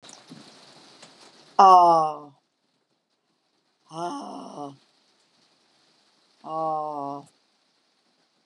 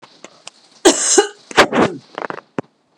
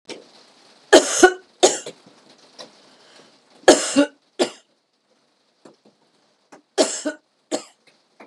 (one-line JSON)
{"exhalation_length": "8.5 s", "exhalation_amplitude": 24025, "exhalation_signal_mean_std_ratio": 0.28, "cough_length": "3.0 s", "cough_amplitude": 32768, "cough_signal_mean_std_ratio": 0.39, "three_cough_length": "8.3 s", "three_cough_amplitude": 32768, "three_cough_signal_mean_std_ratio": 0.27, "survey_phase": "beta (2021-08-13 to 2022-03-07)", "age": "45-64", "gender": "Female", "wearing_mask": "No", "symptom_none": true, "smoker_status": "Never smoked", "respiratory_condition_asthma": false, "respiratory_condition_other": false, "recruitment_source": "REACT", "submission_delay": "2 days", "covid_test_result": "Negative", "covid_test_method": "RT-qPCR", "influenza_a_test_result": "Unknown/Void", "influenza_b_test_result": "Unknown/Void"}